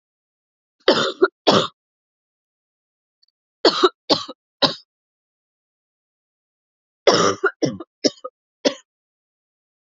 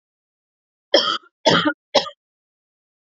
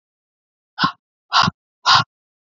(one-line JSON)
{"three_cough_length": "10.0 s", "three_cough_amplitude": 32767, "three_cough_signal_mean_std_ratio": 0.29, "cough_length": "3.2 s", "cough_amplitude": 28038, "cough_signal_mean_std_ratio": 0.32, "exhalation_length": "2.6 s", "exhalation_amplitude": 31833, "exhalation_signal_mean_std_ratio": 0.32, "survey_phase": "alpha (2021-03-01 to 2021-08-12)", "age": "18-44", "gender": "Female", "wearing_mask": "No", "symptom_cough_any": true, "symptom_fatigue": true, "symptom_headache": true, "symptom_change_to_sense_of_smell_or_taste": true, "symptom_onset": "7 days", "smoker_status": "Never smoked", "respiratory_condition_asthma": false, "respiratory_condition_other": false, "recruitment_source": "Test and Trace", "submission_delay": "2 days", "covid_test_result": "Positive", "covid_test_method": "RT-qPCR"}